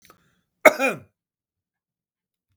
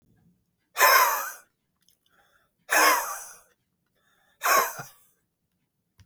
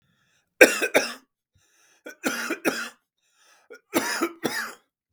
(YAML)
cough_length: 2.6 s
cough_amplitude: 32768
cough_signal_mean_std_ratio: 0.18
exhalation_length: 6.1 s
exhalation_amplitude: 18774
exhalation_signal_mean_std_ratio: 0.35
three_cough_length: 5.1 s
three_cough_amplitude: 32768
three_cough_signal_mean_std_ratio: 0.33
survey_phase: beta (2021-08-13 to 2022-03-07)
age: 45-64
gender: Male
wearing_mask: 'No'
symptom_cough_any: true
symptom_runny_or_blocked_nose: true
symptom_diarrhoea: true
symptom_onset: 12 days
smoker_status: Ex-smoker
respiratory_condition_asthma: true
respiratory_condition_other: false
recruitment_source: REACT
submission_delay: 6 days
covid_test_result: Negative
covid_test_method: RT-qPCR
influenza_a_test_result: Negative
influenza_b_test_result: Negative